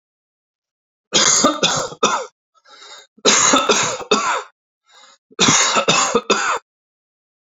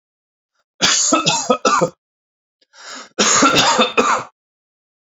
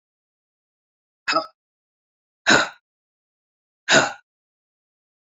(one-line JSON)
{"three_cough_length": "7.6 s", "three_cough_amplitude": 32768, "three_cough_signal_mean_std_ratio": 0.53, "cough_length": "5.1 s", "cough_amplitude": 32768, "cough_signal_mean_std_ratio": 0.53, "exhalation_length": "5.3 s", "exhalation_amplitude": 26910, "exhalation_signal_mean_std_ratio": 0.24, "survey_phase": "beta (2021-08-13 to 2022-03-07)", "age": "45-64", "gender": "Male", "wearing_mask": "No", "symptom_sore_throat": true, "symptom_change_to_sense_of_smell_or_taste": true, "symptom_loss_of_taste": true, "symptom_onset": "4 days", "smoker_status": "Never smoked", "respiratory_condition_asthma": false, "respiratory_condition_other": false, "recruitment_source": "Test and Trace", "submission_delay": "2 days", "covid_test_result": "Positive", "covid_test_method": "RT-qPCR", "covid_ct_value": 19.2, "covid_ct_gene": "ORF1ab gene"}